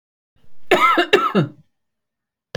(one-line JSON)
{"cough_length": "2.6 s", "cough_amplitude": 29648, "cough_signal_mean_std_ratio": 0.46, "survey_phase": "beta (2021-08-13 to 2022-03-07)", "age": "65+", "gender": "Female", "wearing_mask": "No", "symptom_none": true, "smoker_status": "Never smoked", "respiratory_condition_asthma": false, "respiratory_condition_other": false, "recruitment_source": "REACT", "submission_delay": "3 days", "covid_test_result": "Negative", "covid_test_method": "RT-qPCR"}